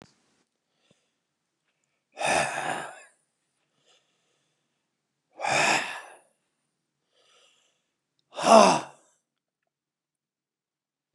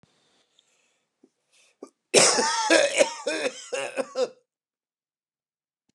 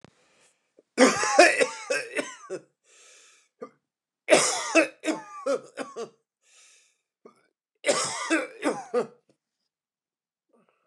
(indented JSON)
{
  "exhalation_length": "11.1 s",
  "exhalation_amplitude": 28525,
  "exhalation_signal_mean_std_ratio": 0.24,
  "cough_length": "5.9 s",
  "cough_amplitude": 23088,
  "cough_signal_mean_std_ratio": 0.38,
  "three_cough_length": "10.9 s",
  "three_cough_amplitude": 23401,
  "three_cough_signal_mean_std_ratio": 0.37,
  "survey_phase": "beta (2021-08-13 to 2022-03-07)",
  "age": "65+",
  "gender": "Male",
  "wearing_mask": "No",
  "symptom_cough_any": true,
  "symptom_runny_or_blocked_nose": true,
  "symptom_shortness_of_breath": true,
  "smoker_status": "Never smoked",
  "respiratory_condition_asthma": false,
  "respiratory_condition_other": false,
  "recruitment_source": "REACT",
  "submission_delay": "1 day",
  "covid_test_result": "Negative",
  "covid_test_method": "RT-qPCR",
  "influenza_a_test_result": "Unknown/Void",
  "influenza_b_test_result": "Unknown/Void"
}